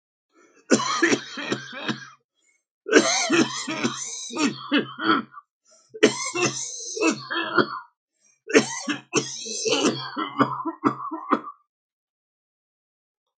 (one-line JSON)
{"cough_length": "13.4 s", "cough_amplitude": 32487, "cough_signal_mean_std_ratio": 0.51, "survey_phase": "alpha (2021-03-01 to 2021-08-12)", "age": "65+", "gender": "Male", "wearing_mask": "No", "symptom_none": true, "smoker_status": "Ex-smoker", "respiratory_condition_asthma": true, "respiratory_condition_other": true, "recruitment_source": "REACT", "submission_delay": "2 days", "covid_test_result": "Negative", "covid_test_method": "RT-qPCR"}